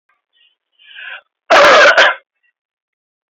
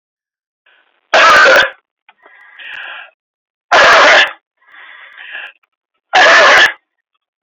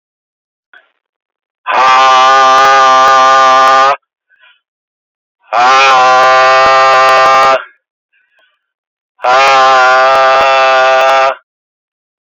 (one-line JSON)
{"cough_length": "3.3 s", "cough_amplitude": 29954, "cough_signal_mean_std_ratio": 0.4, "three_cough_length": "7.4 s", "three_cough_amplitude": 32262, "three_cough_signal_mean_std_ratio": 0.47, "exhalation_length": "12.3 s", "exhalation_amplitude": 30166, "exhalation_signal_mean_std_ratio": 0.79, "survey_phase": "beta (2021-08-13 to 2022-03-07)", "age": "45-64", "gender": "Male", "wearing_mask": "Yes", "symptom_none": true, "smoker_status": "Never smoked", "respiratory_condition_asthma": false, "respiratory_condition_other": false, "recruitment_source": "REACT", "submission_delay": "2 days", "covid_test_result": "Negative", "covid_test_method": "RT-qPCR", "influenza_a_test_result": "Negative", "influenza_b_test_result": "Negative"}